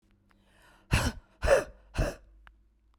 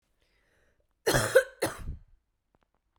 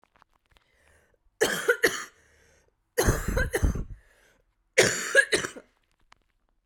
{"exhalation_length": "3.0 s", "exhalation_amplitude": 12816, "exhalation_signal_mean_std_ratio": 0.36, "cough_length": "3.0 s", "cough_amplitude": 15141, "cough_signal_mean_std_ratio": 0.3, "three_cough_length": "6.7 s", "three_cough_amplitude": 17006, "three_cough_signal_mean_std_ratio": 0.39, "survey_phase": "beta (2021-08-13 to 2022-03-07)", "age": "45-64", "gender": "Female", "wearing_mask": "No", "symptom_cough_any": true, "symptom_runny_or_blocked_nose": true, "symptom_shortness_of_breath": true, "symptom_fatigue": true, "symptom_fever_high_temperature": true, "symptom_headache": true, "symptom_onset": "2 days", "smoker_status": "Never smoked", "respiratory_condition_asthma": true, "respiratory_condition_other": false, "recruitment_source": "Test and Trace", "submission_delay": "1 day", "covid_test_result": "Positive", "covid_test_method": "RT-qPCR"}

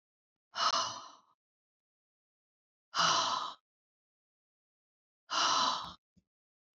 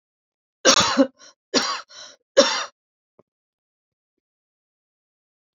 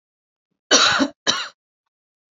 {"exhalation_length": "6.7 s", "exhalation_amplitude": 5281, "exhalation_signal_mean_std_ratio": 0.38, "three_cough_length": "5.5 s", "three_cough_amplitude": 31629, "three_cough_signal_mean_std_ratio": 0.29, "cough_length": "2.3 s", "cough_amplitude": 30051, "cough_signal_mean_std_ratio": 0.38, "survey_phase": "alpha (2021-03-01 to 2021-08-12)", "age": "45-64", "gender": "Female", "wearing_mask": "No", "symptom_cough_any": true, "symptom_abdominal_pain": true, "symptom_diarrhoea": true, "symptom_fatigue": true, "symptom_fever_high_temperature": true, "symptom_headache": true, "symptom_change_to_sense_of_smell_or_taste": true, "symptom_loss_of_taste": true, "symptom_onset": "3 days", "smoker_status": "Ex-smoker", "respiratory_condition_asthma": true, "respiratory_condition_other": false, "recruitment_source": "Test and Trace", "submission_delay": "2 days", "covid_test_result": "Positive", "covid_test_method": "RT-qPCR"}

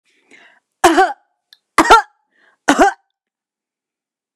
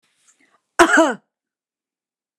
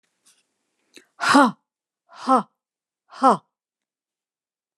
{"three_cough_length": "4.4 s", "three_cough_amplitude": 29204, "three_cough_signal_mean_std_ratio": 0.32, "cough_length": "2.4 s", "cough_amplitude": 29204, "cough_signal_mean_std_ratio": 0.28, "exhalation_length": "4.8 s", "exhalation_amplitude": 25793, "exhalation_signal_mean_std_ratio": 0.27, "survey_phase": "beta (2021-08-13 to 2022-03-07)", "age": "65+", "gender": "Female", "wearing_mask": "No", "symptom_none": true, "smoker_status": "Never smoked", "respiratory_condition_asthma": false, "respiratory_condition_other": false, "recruitment_source": "REACT", "submission_delay": "2 days", "covid_test_result": "Negative", "covid_test_method": "RT-qPCR"}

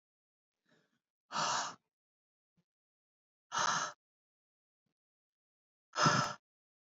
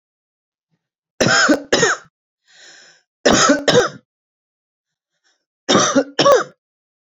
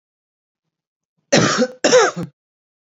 {"exhalation_length": "7.0 s", "exhalation_amplitude": 5282, "exhalation_signal_mean_std_ratio": 0.3, "three_cough_length": "7.1 s", "three_cough_amplitude": 29647, "three_cough_signal_mean_std_ratio": 0.42, "cough_length": "2.8 s", "cough_amplitude": 31948, "cough_signal_mean_std_ratio": 0.4, "survey_phase": "beta (2021-08-13 to 2022-03-07)", "age": "18-44", "gender": "Female", "wearing_mask": "No", "symptom_none": true, "smoker_status": "Current smoker (1 to 10 cigarettes per day)", "respiratory_condition_asthma": false, "respiratory_condition_other": false, "recruitment_source": "REACT", "submission_delay": "3 days", "covid_test_result": "Negative", "covid_test_method": "RT-qPCR", "influenza_a_test_result": "Negative", "influenza_b_test_result": "Negative"}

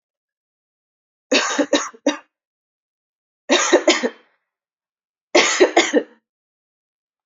{"three_cough_length": "7.3 s", "three_cough_amplitude": 28670, "three_cough_signal_mean_std_ratio": 0.36, "survey_phase": "beta (2021-08-13 to 2022-03-07)", "age": "18-44", "gender": "Female", "wearing_mask": "No", "symptom_runny_or_blocked_nose": true, "smoker_status": "Never smoked", "respiratory_condition_asthma": false, "respiratory_condition_other": false, "recruitment_source": "REACT", "submission_delay": "2 days", "covid_test_result": "Negative", "covid_test_method": "RT-qPCR", "influenza_a_test_result": "Negative", "influenza_b_test_result": "Negative"}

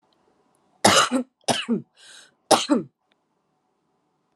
{"three_cough_length": "4.4 s", "three_cough_amplitude": 32753, "three_cough_signal_mean_std_ratio": 0.34, "survey_phase": "beta (2021-08-13 to 2022-03-07)", "age": "18-44", "gender": "Female", "wearing_mask": "No", "symptom_none": true, "symptom_onset": "4 days", "smoker_status": "Never smoked", "respiratory_condition_asthma": false, "respiratory_condition_other": false, "recruitment_source": "REACT", "submission_delay": "1 day", "covid_test_result": "Negative", "covid_test_method": "RT-qPCR"}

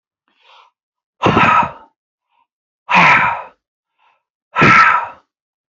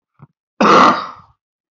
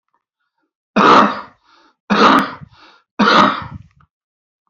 {"exhalation_length": "5.7 s", "exhalation_amplitude": 32768, "exhalation_signal_mean_std_ratio": 0.42, "cough_length": "1.7 s", "cough_amplitude": 27748, "cough_signal_mean_std_ratio": 0.42, "three_cough_length": "4.7 s", "three_cough_amplitude": 31165, "three_cough_signal_mean_std_ratio": 0.42, "survey_phase": "beta (2021-08-13 to 2022-03-07)", "age": "45-64", "gender": "Male", "wearing_mask": "No", "symptom_runny_or_blocked_nose": true, "symptom_onset": "7 days", "smoker_status": "Never smoked", "respiratory_condition_asthma": false, "respiratory_condition_other": false, "recruitment_source": "REACT", "submission_delay": "0 days", "covid_test_result": "Negative", "covid_test_method": "RT-qPCR"}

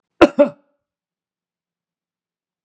{"cough_length": "2.6 s", "cough_amplitude": 32768, "cough_signal_mean_std_ratio": 0.18, "survey_phase": "beta (2021-08-13 to 2022-03-07)", "age": "65+", "gender": "Male", "wearing_mask": "No", "symptom_runny_or_blocked_nose": true, "smoker_status": "Never smoked", "respiratory_condition_asthma": false, "respiratory_condition_other": false, "recruitment_source": "REACT", "submission_delay": "1 day", "covid_test_result": "Negative", "covid_test_method": "RT-qPCR", "influenza_a_test_result": "Negative", "influenza_b_test_result": "Negative"}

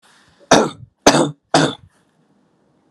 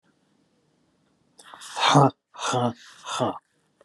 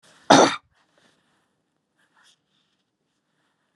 {"three_cough_length": "2.9 s", "three_cough_amplitude": 32768, "three_cough_signal_mean_std_ratio": 0.35, "exhalation_length": "3.8 s", "exhalation_amplitude": 21448, "exhalation_signal_mean_std_ratio": 0.37, "cough_length": "3.8 s", "cough_amplitude": 32425, "cough_signal_mean_std_ratio": 0.19, "survey_phase": "beta (2021-08-13 to 2022-03-07)", "age": "65+", "gender": "Male", "wearing_mask": "No", "symptom_none": true, "smoker_status": "Ex-smoker", "respiratory_condition_asthma": false, "respiratory_condition_other": false, "recruitment_source": "REACT", "submission_delay": "4 days", "covid_test_result": "Negative", "covid_test_method": "RT-qPCR", "influenza_a_test_result": "Negative", "influenza_b_test_result": "Negative"}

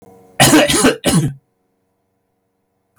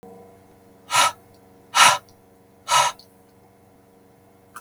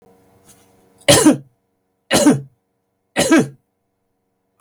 {"cough_length": "3.0 s", "cough_amplitude": 32768, "cough_signal_mean_std_ratio": 0.45, "exhalation_length": "4.6 s", "exhalation_amplitude": 31283, "exhalation_signal_mean_std_ratio": 0.32, "three_cough_length": "4.6 s", "three_cough_amplitude": 32768, "three_cough_signal_mean_std_ratio": 0.35, "survey_phase": "beta (2021-08-13 to 2022-03-07)", "age": "65+", "gender": "Male", "wearing_mask": "No", "symptom_none": true, "smoker_status": "Never smoked", "respiratory_condition_asthma": false, "respiratory_condition_other": false, "recruitment_source": "REACT", "submission_delay": "11 days", "covid_test_result": "Negative", "covid_test_method": "RT-qPCR", "influenza_a_test_result": "Negative", "influenza_b_test_result": "Negative"}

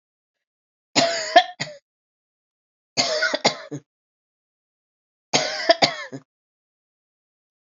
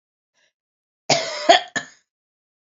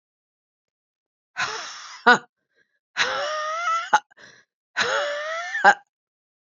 {"three_cough_length": "7.7 s", "three_cough_amplitude": 28964, "three_cough_signal_mean_std_ratio": 0.31, "cough_length": "2.7 s", "cough_amplitude": 31358, "cough_signal_mean_std_ratio": 0.28, "exhalation_length": "6.5 s", "exhalation_amplitude": 27898, "exhalation_signal_mean_std_ratio": 0.39, "survey_phase": "beta (2021-08-13 to 2022-03-07)", "age": "45-64", "gender": "Female", "wearing_mask": "No", "symptom_cough_any": true, "symptom_runny_or_blocked_nose": true, "symptom_shortness_of_breath": true, "symptom_diarrhoea": true, "symptom_fatigue": true, "symptom_other": true, "symptom_onset": "3 days", "smoker_status": "Never smoked", "respiratory_condition_asthma": false, "respiratory_condition_other": false, "recruitment_source": "Test and Trace", "submission_delay": "1 day", "covid_test_result": "Positive", "covid_test_method": "ePCR"}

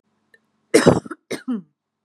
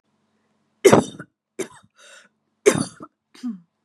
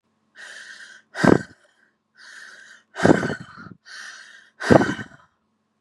{"cough_length": "2.0 s", "cough_amplitude": 32767, "cough_signal_mean_std_ratio": 0.31, "three_cough_length": "3.8 s", "three_cough_amplitude": 32767, "three_cough_signal_mean_std_ratio": 0.25, "exhalation_length": "5.8 s", "exhalation_amplitude": 32768, "exhalation_signal_mean_std_ratio": 0.29, "survey_phase": "beta (2021-08-13 to 2022-03-07)", "age": "18-44", "gender": "Female", "wearing_mask": "No", "symptom_none": true, "smoker_status": "Ex-smoker", "respiratory_condition_asthma": true, "respiratory_condition_other": false, "recruitment_source": "REACT", "submission_delay": "0 days", "covid_test_result": "Negative", "covid_test_method": "RT-qPCR", "influenza_a_test_result": "Negative", "influenza_b_test_result": "Negative"}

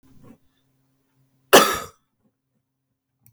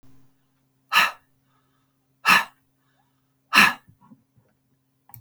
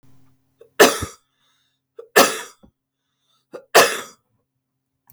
{"cough_length": "3.3 s", "cough_amplitude": 32768, "cough_signal_mean_std_ratio": 0.19, "exhalation_length": "5.2 s", "exhalation_amplitude": 31758, "exhalation_signal_mean_std_ratio": 0.26, "three_cough_length": "5.1 s", "three_cough_amplitude": 32768, "three_cough_signal_mean_std_ratio": 0.26, "survey_phase": "beta (2021-08-13 to 2022-03-07)", "age": "65+", "gender": "Female", "wearing_mask": "No", "symptom_cough_any": true, "symptom_shortness_of_breath": true, "smoker_status": "Never smoked", "respiratory_condition_asthma": false, "respiratory_condition_other": true, "recruitment_source": "REACT", "submission_delay": "2 days", "covid_test_result": "Negative", "covid_test_method": "RT-qPCR", "influenza_a_test_result": "Negative", "influenza_b_test_result": "Negative"}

